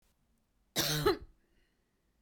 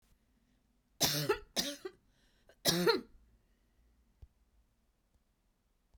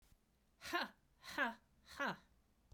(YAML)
cough_length: 2.2 s
cough_amplitude: 5179
cough_signal_mean_std_ratio: 0.35
three_cough_length: 6.0 s
three_cough_amplitude: 5855
three_cough_signal_mean_std_ratio: 0.31
exhalation_length: 2.7 s
exhalation_amplitude: 1609
exhalation_signal_mean_std_ratio: 0.41
survey_phase: beta (2021-08-13 to 2022-03-07)
age: 45-64
gender: Female
wearing_mask: 'No'
symptom_none: true
smoker_status: Never smoked
respiratory_condition_asthma: false
respiratory_condition_other: false
recruitment_source: Test and Trace
submission_delay: 2 days
covid_test_result: Negative
covid_test_method: RT-qPCR